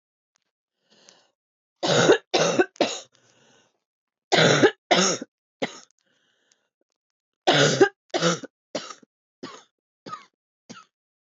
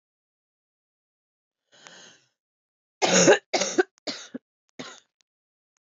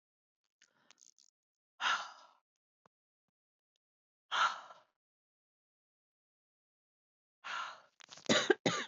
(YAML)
three_cough_length: 11.3 s
three_cough_amplitude: 19979
three_cough_signal_mean_std_ratio: 0.35
cough_length: 5.9 s
cough_amplitude: 17839
cough_signal_mean_std_ratio: 0.25
exhalation_length: 8.9 s
exhalation_amplitude: 7615
exhalation_signal_mean_std_ratio: 0.26
survey_phase: beta (2021-08-13 to 2022-03-07)
age: 45-64
gender: Female
wearing_mask: 'No'
symptom_cough_any: true
symptom_new_continuous_cough: true
symptom_runny_or_blocked_nose: true
symptom_shortness_of_breath: true
symptom_abdominal_pain: true
symptom_fatigue: true
symptom_headache: true
symptom_other: true
symptom_onset: 3 days
smoker_status: Ex-smoker
respiratory_condition_asthma: false
respiratory_condition_other: false
recruitment_source: Test and Trace
submission_delay: 2 days
covid_test_result: Positive
covid_test_method: ePCR